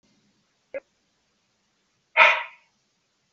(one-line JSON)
{"exhalation_length": "3.3 s", "exhalation_amplitude": 32442, "exhalation_signal_mean_std_ratio": 0.21, "survey_phase": "beta (2021-08-13 to 2022-03-07)", "age": "65+", "gender": "Male", "wearing_mask": "No", "symptom_none": true, "smoker_status": "Never smoked", "respiratory_condition_asthma": false, "respiratory_condition_other": false, "recruitment_source": "REACT", "submission_delay": "1 day", "covid_test_result": "Negative", "covid_test_method": "RT-qPCR", "influenza_a_test_result": "Negative", "influenza_b_test_result": "Negative"}